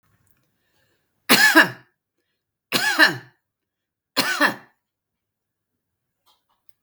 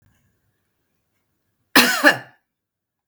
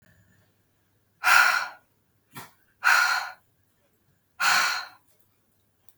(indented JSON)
{
  "three_cough_length": "6.8 s",
  "three_cough_amplitude": 32768,
  "three_cough_signal_mean_std_ratio": 0.3,
  "cough_length": "3.1 s",
  "cough_amplitude": 32768,
  "cough_signal_mean_std_ratio": 0.26,
  "exhalation_length": "6.0 s",
  "exhalation_amplitude": 23280,
  "exhalation_signal_mean_std_ratio": 0.37,
  "survey_phase": "beta (2021-08-13 to 2022-03-07)",
  "age": "45-64",
  "gender": "Female",
  "wearing_mask": "No",
  "symptom_none": true,
  "smoker_status": "Current smoker (1 to 10 cigarettes per day)",
  "respiratory_condition_asthma": false,
  "respiratory_condition_other": false,
  "recruitment_source": "REACT",
  "submission_delay": "1 day",
  "covid_test_result": "Negative",
  "covid_test_method": "RT-qPCR",
  "influenza_a_test_result": "Negative",
  "influenza_b_test_result": "Negative"
}